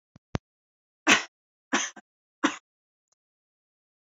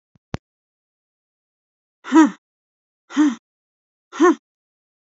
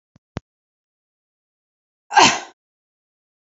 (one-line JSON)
{"three_cough_length": "4.0 s", "three_cough_amplitude": 18804, "three_cough_signal_mean_std_ratio": 0.22, "exhalation_length": "5.1 s", "exhalation_amplitude": 24629, "exhalation_signal_mean_std_ratio": 0.26, "cough_length": "3.5 s", "cough_amplitude": 28366, "cough_signal_mean_std_ratio": 0.2, "survey_phase": "beta (2021-08-13 to 2022-03-07)", "age": "45-64", "gender": "Female", "wearing_mask": "No", "symptom_none": true, "smoker_status": "Never smoked", "respiratory_condition_asthma": false, "respiratory_condition_other": false, "recruitment_source": "REACT", "submission_delay": "1 day", "covid_test_result": "Negative", "covid_test_method": "RT-qPCR"}